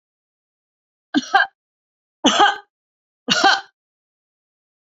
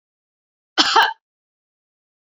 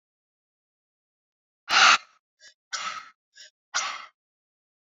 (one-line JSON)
{"three_cough_length": "4.9 s", "three_cough_amplitude": 31747, "three_cough_signal_mean_std_ratio": 0.31, "cough_length": "2.2 s", "cough_amplitude": 32566, "cough_signal_mean_std_ratio": 0.28, "exhalation_length": "4.9 s", "exhalation_amplitude": 20126, "exhalation_signal_mean_std_ratio": 0.25, "survey_phase": "beta (2021-08-13 to 2022-03-07)", "age": "65+", "gender": "Female", "wearing_mask": "No", "symptom_none": true, "smoker_status": "Never smoked", "respiratory_condition_asthma": false, "respiratory_condition_other": false, "recruitment_source": "REACT", "submission_delay": "1 day", "covid_test_result": "Negative", "covid_test_method": "RT-qPCR"}